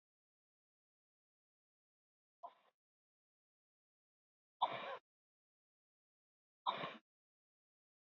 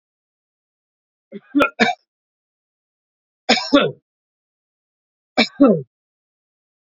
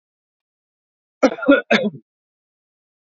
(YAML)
exhalation_length: 8.0 s
exhalation_amplitude: 2438
exhalation_signal_mean_std_ratio: 0.19
three_cough_length: 7.0 s
three_cough_amplitude: 31058
three_cough_signal_mean_std_ratio: 0.28
cough_length: 3.1 s
cough_amplitude: 28204
cough_signal_mean_std_ratio: 0.28
survey_phase: beta (2021-08-13 to 2022-03-07)
age: 45-64
gender: Male
wearing_mask: 'No'
symptom_sore_throat: true
symptom_headache: true
smoker_status: Current smoker (e-cigarettes or vapes only)
respiratory_condition_asthma: false
respiratory_condition_other: false
recruitment_source: Test and Trace
submission_delay: 2 days
covid_test_result: Positive
covid_test_method: RT-qPCR
covid_ct_value: 22.2
covid_ct_gene: N gene
covid_ct_mean: 22.6
covid_viral_load: 39000 copies/ml
covid_viral_load_category: Low viral load (10K-1M copies/ml)